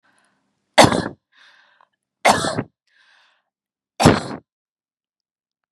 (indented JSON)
{
  "three_cough_length": "5.7 s",
  "three_cough_amplitude": 32768,
  "three_cough_signal_mean_std_ratio": 0.26,
  "survey_phase": "beta (2021-08-13 to 2022-03-07)",
  "age": "45-64",
  "gender": "Female",
  "wearing_mask": "No",
  "symptom_none": true,
  "smoker_status": "Ex-smoker",
  "respiratory_condition_asthma": false,
  "respiratory_condition_other": false,
  "recruitment_source": "REACT",
  "submission_delay": "2 days",
  "covid_test_result": "Negative",
  "covid_test_method": "RT-qPCR",
  "influenza_a_test_result": "Negative",
  "influenza_b_test_result": "Negative"
}